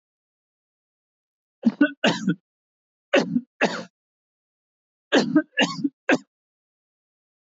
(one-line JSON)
{"cough_length": "7.4 s", "cough_amplitude": 16657, "cough_signal_mean_std_ratio": 0.33, "survey_phase": "beta (2021-08-13 to 2022-03-07)", "age": "45-64", "gender": "Male", "wearing_mask": "No", "symptom_none": true, "smoker_status": "Never smoked", "respiratory_condition_asthma": false, "respiratory_condition_other": false, "recruitment_source": "REACT", "submission_delay": "6 days", "covid_test_result": "Negative", "covid_test_method": "RT-qPCR", "influenza_a_test_result": "Negative", "influenza_b_test_result": "Negative"}